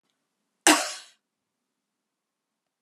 {"cough_length": "2.8 s", "cough_amplitude": 32768, "cough_signal_mean_std_ratio": 0.19, "survey_phase": "beta (2021-08-13 to 2022-03-07)", "age": "45-64", "gender": "Female", "wearing_mask": "No", "symptom_cough_any": true, "symptom_shortness_of_breath": true, "symptom_diarrhoea": true, "smoker_status": "Ex-smoker", "respiratory_condition_asthma": false, "respiratory_condition_other": true, "recruitment_source": "REACT", "submission_delay": "0 days", "covid_test_result": "Negative", "covid_test_method": "RT-qPCR", "influenza_a_test_result": "Negative", "influenza_b_test_result": "Negative"}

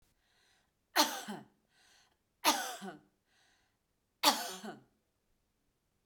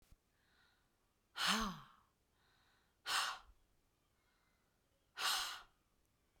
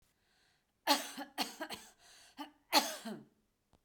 {"three_cough_length": "6.1 s", "three_cough_amplitude": 10164, "three_cough_signal_mean_std_ratio": 0.28, "exhalation_length": "6.4 s", "exhalation_amplitude": 3244, "exhalation_signal_mean_std_ratio": 0.34, "cough_length": "3.8 s", "cough_amplitude": 6838, "cough_signal_mean_std_ratio": 0.33, "survey_phase": "alpha (2021-03-01 to 2021-08-12)", "age": "45-64", "gender": "Female", "wearing_mask": "No", "symptom_fatigue": true, "smoker_status": "Never smoked", "respiratory_condition_asthma": false, "respiratory_condition_other": true, "recruitment_source": "Test and Trace", "submission_delay": "2 days", "covid_test_result": "Positive", "covid_test_method": "RT-qPCR", "covid_ct_value": 22.1, "covid_ct_gene": "ORF1ab gene"}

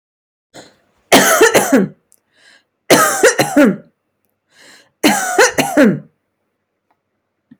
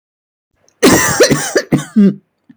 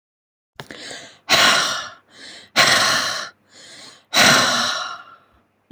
{"three_cough_length": "7.6 s", "three_cough_amplitude": 32768, "three_cough_signal_mean_std_ratio": 0.45, "cough_length": "2.6 s", "cough_amplitude": 32768, "cough_signal_mean_std_ratio": 0.54, "exhalation_length": "5.7 s", "exhalation_amplitude": 29324, "exhalation_signal_mean_std_ratio": 0.5, "survey_phase": "beta (2021-08-13 to 2022-03-07)", "age": "18-44", "gender": "Female", "wearing_mask": "No", "symptom_none": true, "smoker_status": "Never smoked", "respiratory_condition_asthma": false, "respiratory_condition_other": false, "recruitment_source": "REACT", "submission_delay": "1 day", "covid_test_result": "Negative", "covid_test_method": "RT-qPCR", "influenza_a_test_result": "Unknown/Void", "influenza_b_test_result": "Unknown/Void"}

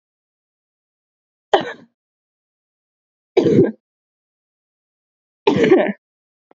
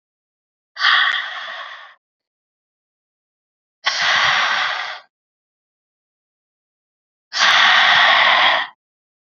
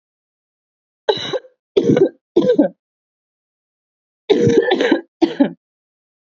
{"three_cough_length": "6.6 s", "three_cough_amplitude": 31178, "three_cough_signal_mean_std_ratio": 0.29, "exhalation_length": "9.2 s", "exhalation_amplitude": 28491, "exhalation_signal_mean_std_ratio": 0.47, "cough_length": "6.4 s", "cough_amplitude": 28215, "cough_signal_mean_std_ratio": 0.41, "survey_phase": "alpha (2021-03-01 to 2021-08-12)", "age": "18-44", "gender": "Female", "wearing_mask": "No", "symptom_cough_any": true, "symptom_new_continuous_cough": true, "symptom_shortness_of_breath": true, "symptom_fatigue": true, "symptom_fever_high_temperature": true, "symptom_headache": true, "symptom_change_to_sense_of_smell_or_taste": true, "smoker_status": "Never smoked", "respiratory_condition_asthma": false, "respiratory_condition_other": false, "recruitment_source": "Test and Trace", "submission_delay": "2 days", "covid_test_result": "Positive", "covid_test_method": "RT-qPCR", "covid_ct_value": 33.6, "covid_ct_gene": "N gene", "covid_ct_mean": 33.7, "covid_viral_load": "9 copies/ml", "covid_viral_load_category": "Minimal viral load (< 10K copies/ml)"}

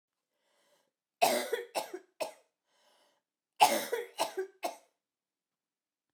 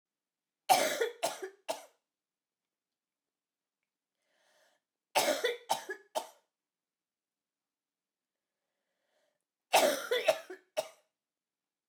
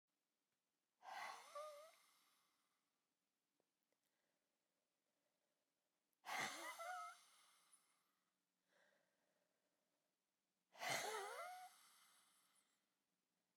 {"cough_length": "6.1 s", "cough_amplitude": 13090, "cough_signal_mean_std_ratio": 0.31, "three_cough_length": "11.9 s", "three_cough_amplitude": 10138, "three_cough_signal_mean_std_ratio": 0.29, "exhalation_length": "13.6 s", "exhalation_amplitude": 749, "exhalation_signal_mean_std_ratio": 0.36, "survey_phase": "beta (2021-08-13 to 2022-03-07)", "age": "45-64", "gender": "Female", "wearing_mask": "No", "symptom_cough_any": true, "symptom_runny_or_blocked_nose": true, "symptom_change_to_sense_of_smell_or_taste": true, "symptom_onset": "12 days", "smoker_status": "Ex-smoker", "respiratory_condition_asthma": false, "respiratory_condition_other": false, "recruitment_source": "REACT", "submission_delay": "3 days", "covid_test_result": "Negative", "covid_test_method": "RT-qPCR"}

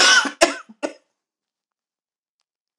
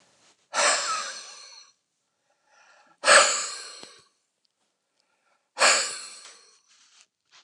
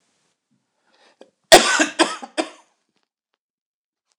{"cough_length": "2.8 s", "cough_amplitude": 29203, "cough_signal_mean_std_ratio": 0.31, "exhalation_length": "7.4 s", "exhalation_amplitude": 26606, "exhalation_signal_mean_std_ratio": 0.32, "three_cough_length": "4.2 s", "three_cough_amplitude": 29204, "three_cough_signal_mean_std_ratio": 0.24, "survey_phase": "alpha (2021-03-01 to 2021-08-12)", "age": "45-64", "gender": "Male", "wearing_mask": "No", "symptom_none": true, "symptom_cough_any": true, "symptom_abdominal_pain": true, "symptom_diarrhoea": true, "smoker_status": "Ex-smoker", "respiratory_condition_asthma": false, "respiratory_condition_other": false, "recruitment_source": "REACT", "submission_delay": "2 days", "covid_test_result": "Negative", "covid_test_method": "RT-qPCR"}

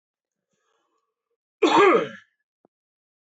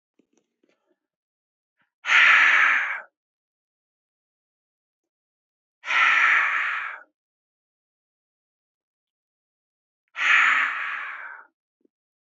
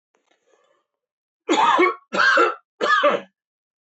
{"cough_length": "3.3 s", "cough_amplitude": 20265, "cough_signal_mean_std_ratio": 0.3, "exhalation_length": "12.4 s", "exhalation_amplitude": 20495, "exhalation_signal_mean_std_ratio": 0.37, "three_cough_length": "3.8 s", "three_cough_amplitude": 17667, "three_cough_signal_mean_std_ratio": 0.49, "survey_phase": "beta (2021-08-13 to 2022-03-07)", "age": "18-44", "gender": "Male", "wearing_mask": "No", "symptom_runny_or_blocked_nose": true, "symptom_diarrhoea": true, "symptom_onset": "12 days", "smoker_status": "Never smoked", "respiratory_condition_asthma": true, "respiratory_condition_other": false, "recruitment_source": "REACT", "submission_delay": "1 day", "covid_test_result": "Negative", "covid_test_method": "RT-qPCR", "influenza_a_test_result": "Negative", "influenza_b_test_result": "Negative"}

